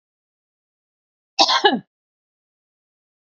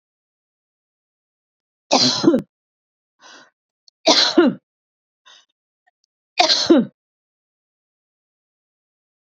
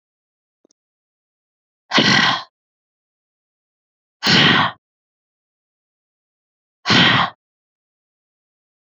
{
  "cough_length": "3.2 s",
  "cough_amplitude": 30715,
  "cough_signal_mean_std_ratio": 0.24,
  "three_cough_length": "9.2 s",
  "three_cough_amplitude": 30830,
  "three_cough_signal_mean_std_ratio": 0.3,
  "exhalation_length": "8.9 s",
  "exhalation_amplitude": 29318,
  "exhalation_signal_mean_std_ratio": 0.31,
  "survey_phase": "beta (2021-08-13 to 2022-03-07)",
  "age": "45-64",
  "gender": "Female",
  "wearing_mask": "No",
  "symptom_fatigue": true,
  "symptom_onset": "12 days",
  "smoker_status": "Never smoked",
  "respiratory_condition_asthma": false,
  "respiratory_condition_other": false,
  "recruitment_source": "REACT",
  "submission_delay": "2 days",
  "covid_test_result": "Negative",
  "covid_test_method": "RT-qPCR",
  "influenza_a_test_result": "Negative",
  "influenza_b_test_result": "Negative"
}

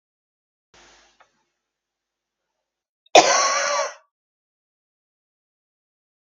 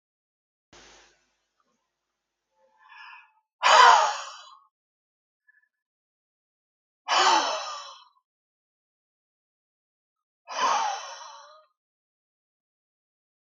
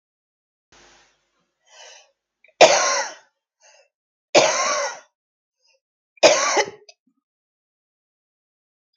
{
  "cough_length": "6.3 s",
  "cough_amplitude": 32768,
  "cough_signal_mean_std_ratio": 0.23,
  "exhalation_length": "13.5 s",
  "exhalation_amplitude": 23602,
  "exhalation_signal_mean_std_ratio": 0.26,
  "three_cough_length": "9.0 s",
  "three_cough_amplitude": 32768,
  "three_cough_signal_mean_std_ratio": 0.29,
  "survey_phase": "beta (2021-08-13 to 2022-03-07)",
  "age": "65+",
  "gender": "Female",
  "wearing_mask": "No",
  "symptom_cough_any": true,
  "symptom_onset": "11 days",
  "smoker_status": "Never smoked",
  "respiratory_condition_asthma": false,
  "respiratory_condition_other": false,
  "recruitment_source": "REACT",
  "submission_delay": "2 days",
  "covid_test_result": "Negative",
  "covid_test_method": "RT-qPCR",
  "influenza_a_test_result": "Negative",
  "influenza_b_test_result": "Negative"
}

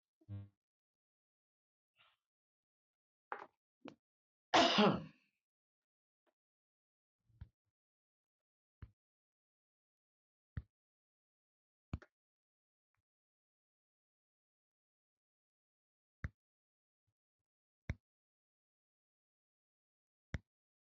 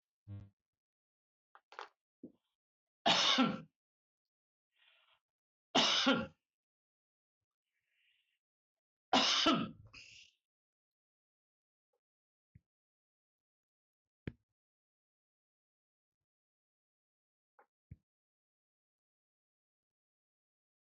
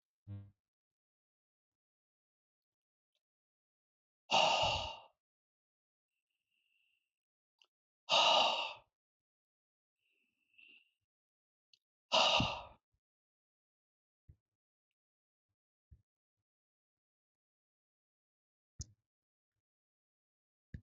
{
  "cough_length": "20.8 s",
  "cough_amplitude": 4232,
  "cough_signal_mean_std_ratio": 0.14,
  "three_cough_length": "20.8 s",
  "three_cough_amplitude": 4131,
  "three_cough_signal_mean_std_ratio": 0.23,
  "exhalation_length": "20.8 s",
  "exhalation_amplitude": 4725,
  "exhalation_signal_mean_std_ratio": 0.22,
  "survey_phase": "beta (2021-08-13 to 2022-03-07)",
  "age": "65+",
  "gender": "Male",
  "wearing_mask": "No",
  "symptom_none": true,
  "smoker_status": "Never smoked",
  "respiratory_condition_asthma": false,
  "respiratory_condition_other": false,
  "recruitment_source": "REACT",
  "submission_delay": "2 days",
  "covid_test_result": "Negative",
  "covid_test_method": "RT-qPCR"
}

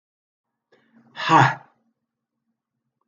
{
  "exhalation_length": "3.1 s",
  "exhalation_amplitude": 27003,
  "exhalation_signal_mean_std_ratio": 0.24,
  "survey_phase": "alpha (2021-03-01 to 2021-08-12)",
  "age": "65+",
  "gender": "Male",
  "wearing_mask": "No",
  "symptom_fatigue": true,
  "symptom_headache": true,
  "symptom_change_to_sense_of_smell_or_taste": true,
  "smoker_status": "Never smoked",
  "respiratory_condition_asthma": false,
  "respiratory_condition_other": false,
  "recruitment_source": "Test and Trace",
  "submission_delay": "2 days",
  "covid_test_result": "Positive",
  "covid_test_method": "LFT"
}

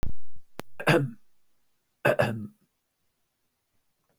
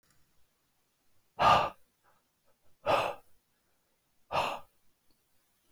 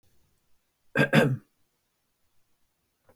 {
  "three_cough_length": "4.2 s",
  "three_cough_amplitude": 14656,
  "three_cough_signal_mean_std_ratio": 0.46,
  "exhalation_length": "5.7 s",
  "exhalation_amplitude": 8675,
  "exhalation_signal_mean_std_ratio": 0.29,
  "cough_length": "3.2 s",
  "cough_amplitude": 14380,
  "cough_signal_mean_std_ratio": 0.27,
  "survey_phase": "beta (2021-08-13 to 2022-03-07)",
  "age": "65+",
  "gender": "Male",
  "wearing_mask": "No",
  "symptom_none": true,
  "smoker_status": "Never smoked",
  "respiratory_condition_asthma": true,
  "respiratory_condition_other": false,
  "recruitment_source": "Test and Trace",
  "submission_delay": "1 day",
  "covid_test_result": "Negative",
  "covid_test_method": "RT-qPCR"
}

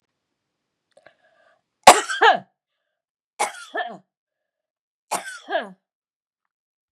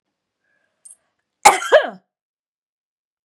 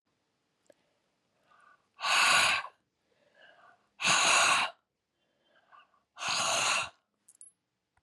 {
  "three_cough_length": "6.9 s",
  "three_cough_amplitude": 32768,
  "three_cough_signal_mean_std_ratio": 0.21,
  "cough_length": "3.2 s",
  "cough_amplitude": 32768,
  "cough_signal_mean_std_ratio": 0.22,
  "exhalation_length": "8.0 s",
  "exhalation_amplitude": 8564,
  "exhalation_signal_mean_std_ratio": 0.41,
  "survey_phase": "beta (2021-08-13 to 2022-03-07)",
  "age": "45-64",
  "gender": "Female",
  "wearing_mask": "No",
  "symptom_none": true,
  "smoker_status": "Never smoked",
  "respiratory_condition_asthma": false,
  "respiratory_condition_other": false,
  "recruitment_source": "REACT",
  "submission_delay": "2 days",
  "covid_test_result": "Negative",
  "covid_test_method": "RT-qPCR",
  "influenza_a_test_result": "Negative",
  "influenza_b_test_result": "Negative"
}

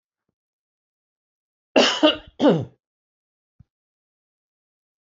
{
  "cough_length": "5.0 s",
  "cough_amplitude": 25853,
  "cough_signal_mean_std_ratio": 0.26,
  "survey_phase": "beta (2021-08-13 to 2022-03-07)",
  "age": "65+",
  "gender": "Male",
  "wearing_mask": "No",
  "symptom_none": true,
  "smoker_status": "Ex-smoker",
  "respiratory_condition_asthma": false,
  "respiratory_condition_other": false,
  "recruitment_source": "REACT",
  "submission_delay": "1 day",
  "covid_test_result": "Negative",
  "covid_test_method": "RT-qPCR"
}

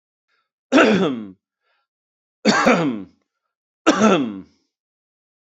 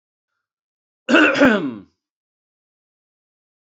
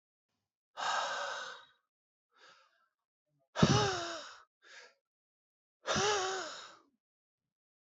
{
  "three_cough_length": "5.5 s",
  "three_cough_amplitude": 31145,
  "three_cough_signal_mean_std_ratio": 0.41,
  "cough_length": "3.7 s",
  "cough_amplitude": 27842,
  "cough_signal_mean_std_ratio": 0.32,
  "exhalation_length": "7.9 s",
  "exhalation_amplitude": 9865,
  "exhalation_signal_mean_std_ratio": 0.38,
  "survey_phase": "beta (2021-08-13 to 2022-03-07)",
  "age": "45-64",
  "gender": "Male",
  "wearing_mask": "No",
  "symptom_cough_any": true,
  "symptom_shortness_of_breath": true,
  "symptom_onset": "12 days",
  "smoker_status": "Current smoker (11 or more cigarettes per day)",
  "respiratory_condition_asthma": false,
  "respiratory_condition_other": false,
  "recruitment_source": "REACT",
  "submission_delay": "2 days",
  "covid_test_result": "Negative",
  "covid_test_method": "RT-qPCR"
}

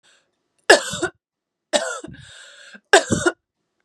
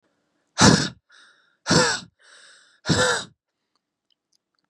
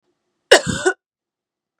{
  "three_cough_length": "3.8 s",
  "three_cough_amplitude": 32768,
  "three_cough_signal_mean_std_ratio": 0.3,
  "exhalation_length": "4.7 s",
  "exhalation_amplitude": 28118,
  "exhalation_signal_mean_std_ratio": 0.34,
  "cough_length": "1.8 s",
  "cough_amplitude": 32768,
  "cough_signal_mean_std_ratio": 0.27,
  "survey_phase": "beta (2021-08-13 to 2022-03-07)",
  "age": "18-44",
  "gender": "Female",
  "wearing_mask": "No",
  "symptom_other": true,
  "symptom_onset": "6 days",
  "smoker_status": "Never smoked",
  "respiratory_condition_asthma": false,
  "respiratory_condition_other": true,
  "recruitment_source": "Test and Trace",
  "submission_delay": "2 days",
  "covid_test_result": "Positive",
  "covid_test_method": "RT-qPCR",
  "covid_ct_value": 19.4,
  "covid_ct_gene": "ORF1ab gene",
  "covid_ct_mean": 19.8,
  "covid_viral_load": "320000 copies/ml",
  "covid_viral_load_category": "Low viral load (10K-1M copies/ml)"
}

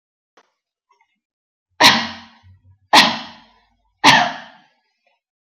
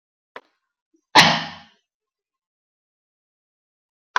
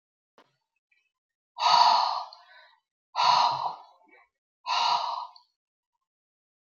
{
  "three_cough_length": "5.5 s",
  "three_cough_amplitude": 32310,
  "three_cough_signal_mean_std_ratio": 0.3,
  "cough_length": "4.2 s",
  "cough_amplitude": 32583,
  "cough_signal_mean_std_ratio": 0.19,
  "exhalation_length": "6.7 s",
  "exhalation_amplitude": 14474,
  "exhalation_signal_mean_std_ratio": 0.4,
  "survey_phase": "beta (2021-08-13 to 2022-03-07)",
  "age": "45-64",
  "gender": "Female",
  "wearing_mask": "No",
  "symptom_none": true,
  "smoker_status": "Never smoked",
  "respiratory_condition_asthma": false,
  "respiratory_condition_other": false,
  "recruitment_source": "REACT",
  "submission_delay": "3 days",
  "covid_test_result": "Negative",
  "covid_test_method": "RT-qPCR",
  "influenza_a_test_result": "Negative",
  "influenza_b_test_result": "Negative"
}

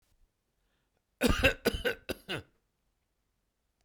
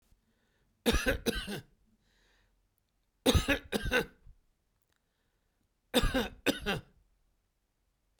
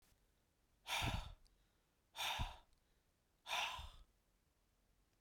{
  "cough_length": "3.8 s",
  "cough_amplitude": 10357,
  "cough_signal_mean_std_ratio": 0.3,
  "three_cough_length": "8.2 s",
  "three_cough_amplitude": 9039,
  "three_cough_signal_mean_std_ratio": 0.35,
  "exhalation_length": "5.2 s",
  "exhalation_amplitude": 1137,
  "exhalation_signal_mean_std_ratio": 0.41,
  "survey_phase": "beta (2021-08-13 to 2022-03-07)",
  "age": "45-64",
  "gender": "Male",
  "wearing_mask": "No",
  "symptom_none": true,
  "smoker_status": "Never smoked",
  "respiratory_condition_asthma": false,
  "respiratory_condition_other": false,
  "recruitment_source": "REACT",
  "submission_delay": "3 days",
  "covid_test_result": "Negative",
  "covid_test_method": "RT-qPCR",
  "influenza_a_test_result": "Negative",
  "influenza_b_test_result": "Negative"
}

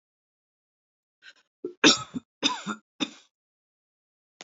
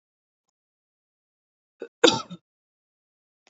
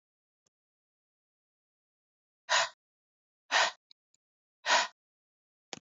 {
  "three_cough_length": "4.4 s",
  "three_cough_amplitude": 25842,
  "three_cough_signal_mean_std_ratio": 0.22,
  "cough_length": "3.5 s",
  "cough_amplitude": 26934,
  "cough_signal_mean_std_ratio": 0.15,
  "exhalation_length": "5.8 s",
  "exhalation_amplitude": 7873,
  "exhalation_signal_mean_std_ratio": 0.24,
  "survey_phase": "alpha (2021-03-01 to 2021-08-12)",
  "age": "18-44",
  "gender": "Female",
  "wearing_mask": "No",
  "symptom_headache": true,
  "symptom_onset": "9 days",
  "smoker_status": "Never smoked",
  "respiratory_condition_asthma": false,
  "respiratory_condition_other": false,
  "recruitment_source": "REACT",
  "submission_delay": "1 day",
  "covid_test_result": "Negative",
  "covid_test_method": "RT-qPCR"
}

